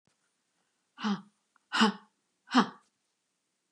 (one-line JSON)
{"exhalation_length": "3.7 s", "exhalation_amplitude": 11718, "exhalation_signal_mean_std_ratio": 0.27, "survey_phase": "beta (2021-08-13 to 2022-03-07)", "age": "65+", "gender": "Female", "wearing_mask": "No", "symptom_sore_throat": true, "smoker_status": "Never smoked", "respiratory_condition_asthma": false, "respiratory_condition_other": false, "recruitment_source": "REACT", "submission_delay": "2 days", "covid_test_result": "Negative", "covid_test_method": "RT-qPCR", "influenza_a_test_result": "Negative", "influenza_b_test_result": "Negative"}